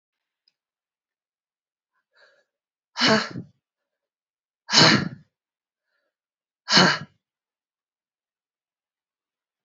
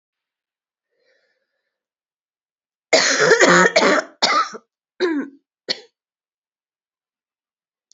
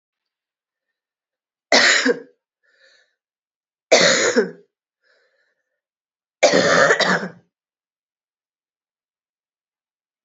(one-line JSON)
{"exhalation_length": "9.6 s", "exhalation_amplitude": 28699, "exhalation_signal_mean_std_ratio": 0.24, "cough_length": "7.9 s", "cough_amplitude": 28990, "cough_signal_mean_std_ratio": 0.35, "three_cough_length": "10.2 s", "three_cough_amplitude": 30817, "three_cough_signal_mean_std_ratio": 0.33, "survey_phase": "beta (2021-08-13 to 2022-03-07)", "age": "45-64", "gender": "Female", "wearing_mask": "No", "symptom_runny_or_blocked_nose": true, "symptom_shortness_of_breath": true, "symptom_sore_throat": true, "symptom_fatigue": true, "symptom_headache": true, "symptom_change_to_sense_of_smell_or_taste": true, "symptom_loss_of_taste": true, "symptom_onset": "6 days", "smoker_status": "Never smoked", "respiratory_condition_asthma": true, "respiratory_condition_other": false, "recruitment_source": "Test and Trace", "submission_delay": "3 days", "covid_test_result": "Positive", "covid_test_method": "RT-qPCR", "covid_ct_value": 12.2, "covid_ct_gene": "ORF1ab gene", "covid_ct_mean": 12.6, "covid_viral_load": "76000000 copies/ml", "covid_viral_load_category": "High viral load (>1M copies/ml)"}